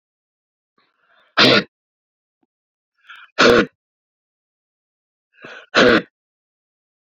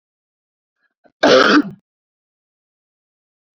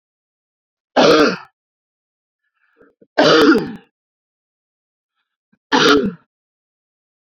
{
  "exhalation_length": "7.1 s",
  "exhalation_amplitude": 32767,
  "exhalation_signal_mean_std_ratio": 0.27,
  "cough_length": "3.6 s",
  "cough_amplitude": 29798,
  "cough_signal_mean_std_ratio": 0.28,
  "three_cough_length": "7.3 s",
  "three_cough_amplitude": 32402,
  "three_cough_signal_mean_std_ratio": 0.34,
  "survey_phase": "beta (2021-08-13 to 2022-03-07)",
  "age": "45-64",
  "gender": "Male",
  "wearing_mask": "No",
  "symptom_shortness_of_breath": true,
  "symptom_change_to_sense_of_smell_or_taste": true,
  "symptom_loss_of_taste": true,
  "symptom_onset": "4 days",
  "smoker_status": "Ex-smoker",
  "respiratory_condition_asthma": false,
  "respiratory_condition_other": false,
  "recruitment_source": "Test and Trace",
  "submission_delay": "3 days",
  "covid_test_result": "Positive",
  "covid_test_method": "RT-qPCR",
  "covid_ct_value": 15.8,
  "covid_ct_gene": "ORF1ab gene",
  "covid_ct_mean": 16.2,
  "covid_viral_load": "4900000 copies/ml",
  "covid_viral_load_category": "High viral load (>1M copies/ml)"
}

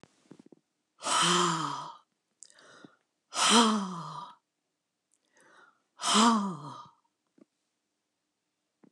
{
  "exhalation_length": "8.9 s",
  "exhalation_amplitude": 12655,
  "exhalation_signal_mean_std_ratio": 0.38,
  "survey_phase": "alpha (2021-03-01 to 2021-08-12)",
  "age": "65+",
  "gender": "Female",
  "wearing_mask": "No",
  "symptom_none": true,
  "smoker_status": "Never smoked",
  "respiratory_condition_asthma": true,
  "respiratory_condition_other": false,
  "recruitment_source": "REACT",
  "submission_delay": "1 day",
  "covid_test_result": "Negative",
  "covid_test_method": "RT-qPCR"
}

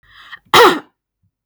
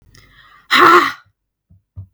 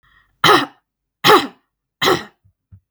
{
  "cough_length": "1.5 s",
  "cough_amplitude": 32768,
  "cough_signal_mean_std_ratio": 0.35,
  "exhalation_length": "2.1 s",
  "exhalation_amplitude": 32768,
  "exhalation_signal_mean_std_ratio": 0.37,
  "three_cough_length": "2.9 s",
  "three_cough_amplitude": 32768,
  "three_cough_signal_mean_std_ratio": 0.36,
  "survey_phase": "beta (2021-08-13 to 2022-03-07)",
  "age": "18-44",
  "gender": "Female",
  "wearing_mask": "No",
  "symptom_none": true,
  "smoker_status": "Never smoked",
  "respiratory_condition_asthma": false,
  "respiratory_condition_other": false,
  "recruitment_source": "REACT",
  "submission_delay": "31 days",
  "covid_test_result": "Negative",
  "covid_test_method": "RT-qPCR",
  "influenza_a_test_result": "Unknown/Void",
  "influenza_b_test_result": "Unknown/Void"
}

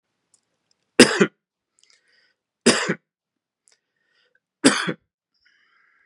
{
  "three_cough_length": "6.1 s",
  "three_cough_amplitude": 32768,
  "three_cough_signal_mean_std_ratio": 0.23,
  "survey_phase": "beta (2021-08-13 to 2022-03-07)",
  "age": "45-64",
  "gender": "Male",
  "wearing_mask": "No",
  "symptom_cough_any": true,
  "symptom_runny_or_blocked_nose": true,
  "symptom_fatigue": true,
  "symptom_headache": true,
  "symptom_onset": "4 days",
  "smoker_status": "Never smoked",
  "respiratory_condition_asthma": false,
  "respiratory_condition_other": false,
  "recruitment_source": "Test and Trace",
  "submission_delay": "2 days",
  "covid_test_result": "Positive",
  "covid_test_method": "ePCR"
}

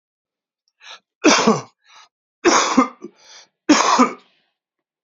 {
  "three_cough_length": "5.0 s",
  "three_cough_amplitude": 31893,
  "three_cough_signal_mean_std_ratio": 0.39,
  "survey_phase": "beta (2021-08-13 to 2022-03-07)",
  "age": "45-64",
  "gender": "Male",
  "wearing_mask": "No",
  "symptom_cough_any": true,
  "symptom_runny_or_blocked_nose": true,
  "symptom_headache": true,
  "symptom_onset": "2 days",
  "smoker_status": "Current smoker (1 to 10 cigarettes per day)",
  "respiratory_condition_asthma": false,
  "respiratory_condition_other": false,
  "recruitment_source": "Test and Trace",
  "submission_delay": "2 days",
  "covid_test_result": "Positive",
  "covid_test_method": "RT-qPCR",
  "covid_ct_value": 15.5,
  "covid_ct_gene": "ORF1ab gene",
  "covid_ct_mean": 16.5,
  "covid_viral_load": "3800000 copies/ml",
  "covid_viral_load_category": "High viral load (>1M copies/ml)"
}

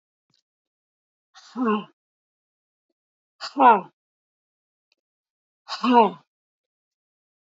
{
  "exhalation_length": "7.6 s",
  "exhalation_amplitude": 26329,
  "exhalation_signal_mean_std_ratio": 0.24,
  "survey_phase": "beta (2021-08-13 to 2022-03-07)",
  "age": "45-64",
  "gender": "Female",
  "wearing_mask": "No",
  "symptom_fatigue": true,
  "symptom_headache": true,
  "smoker_status": "Never smoked",
  "respiratory_condition_asthma": false,
  "respiratory_condition_other": false,
  "recruitment_source": "REACT",
  "submission_delay": "2 days",
  "covid_test_result": "Negative",
  "covid_test_method": "RT-qPCR",
  "influenza_a_test_result": "Negative",
  "influenza_b_test_result": "Negative"
}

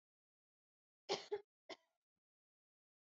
{
  "cough_length": "3.2 s",
  "cough_amplitude": 1473,
  "cough_signal_mean_std_ratio": 0.21,
  "survey_phase": "beta (2021-08-13 to 2022-03-07)",
  "age": "18-44",
  "gender": "Female",
  "wearing_mask": "No",
  "symptom_cough_any": true,
  "symptom_sore_throat": true,
  "symptom_onset": "12 days",
  "smoker_status": "Never smoked",
  "respiratory_condition_asthma": false,
  "respiratory_condition_other": false,
  "recruitment_source": "REACT",
  "submission_delay": "1 day",
  "covid_test_result": "Negative",
  "covid_test_method": "RT-qPCR",
  "influenza_a_test_result": "Negative",
  "influenza_b_test_result": "Negative"
}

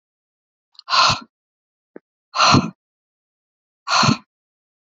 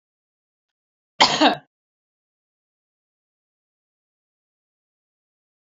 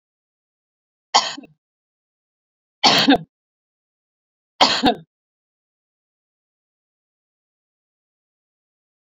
{
  "exhalation_length": "4.9 s",
  "exhalation_amplitude": 30127,
  "exhalation_signal_mean_std_ratio": 0.33,
  "cough_length": "5.7 s",
  "cough_amplitude": 28404,
  "cough_signal_mean_std_ratio": 0.17,
  "three_cough_length": "9.1 s",
  "three_cough_amplitude": 32767,
  "three_cough_signal_mean_std_ratio": 0.22,
  "survey_phase": "alpha (2021-03-01 to 2021-08-12)",
  "age": "45-64",
  "gender": "Female",
  "wearing_mask": "No",
  "symptom_none": true,
  "smoker_status": "Never smoked",
  "respiratory_condition_asthma": false,
  "respiratory_condition_other": false,
  "recruitment_source": "Test and Trace",
  "submission_delay": "0 days",
  "covid_test_result": "Negative",
  "covid_test_method": "LFT"
}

